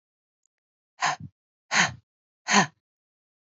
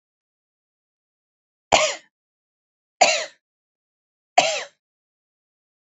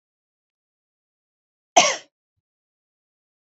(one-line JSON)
{"exhalation_length": "3.4 s", "exhalation_amplitude": 18886, "exhalation_signal_mean_std_ratio": 0.29, "three_cough_length": "5.8 s", "three_cough_amplitude": 30951, "three_cough_signal_mean_std_ratio": 0.24, "cough_length": "3.5 s", "cough_amplitude": 27622, "cough_signal_mean_std_ratio": 0.16, "survey_phase": "beta (2021-08-13 to 2022-03-07)", "age": "18-44", "gender": "Female", "wearing_mask": "No", "symptom_none": true, "smoker_status": "Never smoked", "respiratory_condition_asthma": false, "respiratory_condition_other": false, "recruitment_source": "REACT", "submission_delay": "1 day", "covid_test_result": "Negative", "covid_test_method": "RT-qPCR"}